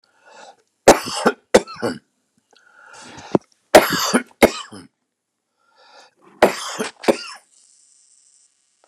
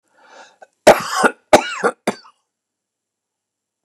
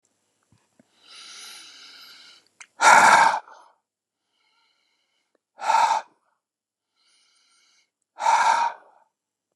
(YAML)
three_cough_length: 8.9 s
three_cough_amplitude: 29204
three_cough_signal_mean_std_ratio: 0.27
cough_length: 3.8 s
cough_amplitude: 29204
cough_signal_mean_std_ratio: 0.28
exhalation_length: 9.6 s
exhalation_amplitude: 29003
exhalation_signal_mean_std_ratio: 0.31
survey_phase: beta (2021-08-13 to 2022-03-07)
age: 65+
gender: Male
wearing_mask: 'No'
symptom_none: true
smoker_status: Ex-smoker
respiratory_condition_asthma: false
respiratory_condition_other: false
recruitment_source: REACT
submission_delay: 1 day
covid_test_result: Negative
covid_test_method: RT-qPCR